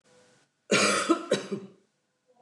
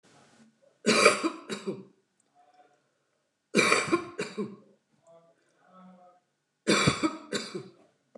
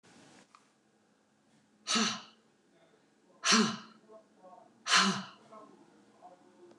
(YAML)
cough_length: 2.4 s
cough_amplitude: 10279
cough_signal_mean_std_ratio: 0.44
three_cough_length: 8.2 s
three_cough_amplitude: 23103
three_cough_signal_mean_std_ratio: 0.36
exhalation_length: 6.8 s
exhalation_amplitude: 10402
exhalation_signal_mean_std_ratio: 0.32
survey_phase: beta (2021-08-13 to 2022-03-07)
age: 65+
gender: Female
wearing_mask: 'No'
symptom_none: true
smoker_status: Never smoked
respiratory_condition_asthma: false
respiratory_condition_other: false
recruitment_source: REACT
submission_delay: 3 days
covid_test_result: Negative
covid_test_method: RT-qPCR